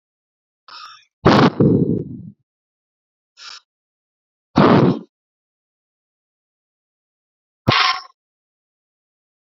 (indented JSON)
{
  "exhalation_length": "9.5 s",
  "exhalation_amplitude": 29196,
  "exhalation_signal_mean_std_ratio": 0.31,
  "survey_phase": "beta (2021-08-13 to 2022-03-07)",
  "age": "18-44",
  "gender": "Male",
  "wearing_mask": "No",
  "symptom_none": true,
  "smoker_status": "Never smoked",
  "respiratory_condition_asthma": false,
  "respiratory_condition_other": false,
  "recruitment_source": "REACT",
  "submission_delay": "1 day",
  "covid_test_result": "Negative",
  "covid_test_method": "RT-qPCR",
  "influenza_a_test_result": "Negative",
  "influenza_b_test_result": "Negative"
}